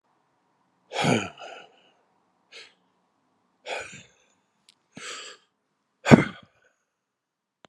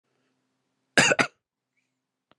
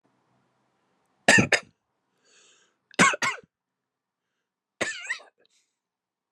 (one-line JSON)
{"exhalation_length": "7.7 s", "exhalation_amplitude": 32768, "exhalation_signal_mean_std_ratio": 0.19, "cough_length": "2.4 s", "cough_amplitude": 19685, "cough_signal_mean_std_ratio": 0.24, "three_cough_length": "6.3 s", "three_cough_amplitude": 22274, "three_cough_signal_mean_std_ratio": 0.24, "survey_phase": "beta (2021-08-13 to 2022-03-07)", "age": "45-64", "wearing_mask": "No", "symptom_runny_or_blocked_nose": true, "symptom_headache": true, "smoker_status": "Never smoked", "respiratory_condition_asthma": false, "respiratory_condition_other": false, "recruitment_source": "Test and Trace", "submission_delay": "8 days", "covid_test_result": "Positive", "covid_test_method": "RT-qPCR", "covid_ct_value": 19.7, "covid_ct_gene": "ORF1ab gene", "covid_ct_mean": 19.9, "covid_viral_load": "310000 copies/ml", "covid_viral_load_category": "Low viral load (10K-1M copies/ml)"}